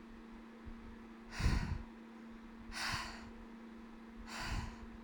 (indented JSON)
{
  "exhalation_length": "5.0 s",
  "exhalation_amplitude": 2784,
  "exhalation_signal_mean_std_ratio": 0.67,
  "survey_phase": "alpha (2021-03-01 to 2021-08-12)",
  "age": "18-44",
  "gender": "Female",
  "wearing_mask": "No",
  "symptom_cough_any": true,
  "symptom_headache": true,
  "smoker_status": "Never smoked",
  "respiratory_condition_asthma": false,
  "respiratory_condition_other": false,
  "recruitment_source": "Test and Trace",
  "submission_delay": "2 days",
  "covid_test_result": "Positive",
  "covid_test_method": "RT-qPCR",
  "covid_ct_value": 12.9,
  "covid_ct_gene": "ORF1ab gene",
  "covid_ct_mean": 13.5,
  "covid_viral_load": "37000000 copies/ml",
  "covid_viral_load_category": "High viral load (>1M copies/ml)"
}